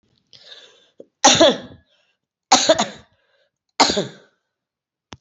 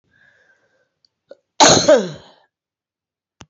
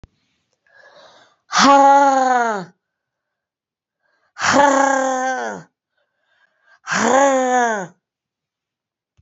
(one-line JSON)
{"three_cough_length": "5.2 s", "three_cough_amplitude": 30917, "three_cough_signal_mean_std_ratio": 0.31, "cough_length": "3.5 s", "cough_amplitude": 32746, "cough_signal_mean_std_ratio": 0.29, "exhalation_length": "9.2 s", "exhalation_amplitude": 29417, "exhalation_signal_mean_std_ratio": 0.48, "survey_phase": "beta (2021-08-13 to 2022-03-07)", "age": "45-64", "gender": "Female", "wearing_mask": "No", "symptom_cough_any": true, "symptom_runny_or_blocked_nose": true, "symptom_shortness_of_breath": true, "symptom_sore_throat": true, "symptom_diarrhoea": true, "symptom_fatigue": true, "symptom_change_to_sense_of_smell_or_taste": true, "symptom_loss_of_taste": true, "symptom_onset": "2 days", "smoker_status": "Ex-smoker", "respiratory_condition_asthma": false, "respiratory_condition_other": false, "recruitment_source": "Test and Trace", "submission_delay": "2 days", "covid_test_result": "Positive", "covid_test_method": "RT-qPCR", "covid_ct_value": 16.9, "covid_ct_gene": "ORF1ab gene", "covid_ct_mean": 17.6, "covid_viral_load": "1700000 copies/ml", "covid_viral_load_category": "High viral load (>1M copies/ml)"}